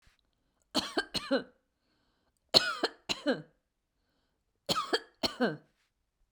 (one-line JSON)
{"cough_length": "6.3 s", "cough_amplitude": 21858, "cough_signal_mean_std_ratio": 0.33, "survey_phase": "beta (2021-08-13 to 2022-03-07)", "age": "45-64", "gender": "Female", "wearing_mask": "No", "symptom_runny_or_blocked_nose": true, "symptom_onset": "2 days", "smoker_status": "Ex-smoker", "respiratory_condition_asthma": false, "respiratory_condition_other": false, "recruitment_source": "REACT", "submission_delay": "1 day", "covid_test_result": "Negative", "covid_test_method": "RT-qPCR", "influenza_a_test_result": "Negative", "influenza_b_test_result": "Negative"}